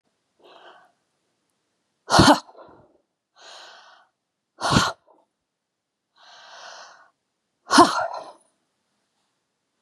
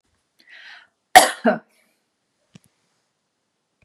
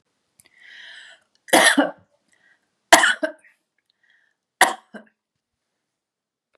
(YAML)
exhalation_length: 9.8 s
exhalation_amplitude: 31595
exhalation_signal_mean_std_ratio: 0.24
cough_length: 3.8 s
cough_amplitude: 32768
cough_signal_mean_std_ratio: 0.18
three_cough_length: 6.6 s
three_cough_amplitude: 32768
three_cough_signal_mean_std_ratio: 0.25
survey_phase: beta (2021-08-13 to 2022-03-07)
age: 65+
gender: Female
wearing_mask: 'No'
symptom_none: true
smoker_status: Never smoked
respiratory_condition_asthma: false
respiratory_condition_other: false
recruitment_source: REACT
submission_delay: 2 days
covid_test_result: Negative
covid_test_method: RT-qPCR
influenza_a_test_result: Negative
influenza_b_test_result: Negative